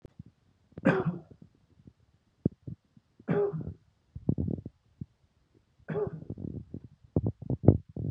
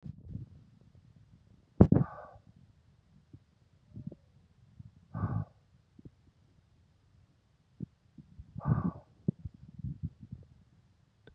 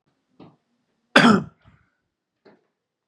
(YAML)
three_cough_length: 8.1 s
three_cough_amplitude: 23186
three_cough_signal_mean_std_ratio: 0.35
exhalation_length: 11.3 s
exhalation_amplitude: 15387
exhalation_signal_mean_std_ratio: 0.23
cough_length: 3.1 s
cough_amplitude: 32767
cough_signal_mean_std_ratio: 0.23
survey_phase: beta (2021-08-13 to 2022-03-07)
age: 45-64
gender: Male
wearing_mask: 'No'
symptom_none: true
symptom_onset: 7 days
smoker_status: Ex-smoker
respiratory_condition_asthma: false
respiratory_condition_other: false
recruitment_source: REACT
submission_delay: 1 day
covid_test_result: Negative
covid_test_method: RT-qPCR
influenza_a_test_result: Negative
influenza_b_test_result: Negative